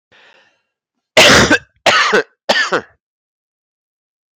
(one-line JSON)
{"three_cough_length": "4.4 s", "three_cough_amplitude": 32768, "three_cough_signal_mean_std_ratio": 0.41, "survey_phase": "beta (2021-08-13 to 2022-03-07)", "age": "18-44", "gender": "Male", "wearing_mask": "No", "symptom_cough_any": true, "symptom_runny_or_blocked_nose": true, "symptom_headache": true, "smoker_status": "Never smoked", "respiratory_condition_asthma": false, "respiratory_condition_other": false, "recruitment_source": "Test and Trace", "submission_delay": "3 days", "covid_test_result": "Positive", "covid_test_method": "RT-qPCR", "covid_ct_value": 17.4, "covid_ct_gene": "ORF1ab gene", "covid_ct_mean": 17.8, "covid_viral_load": "1400000 copies/ml", "covid_viral_load_category": "High viral load (>1M copies/ml)"}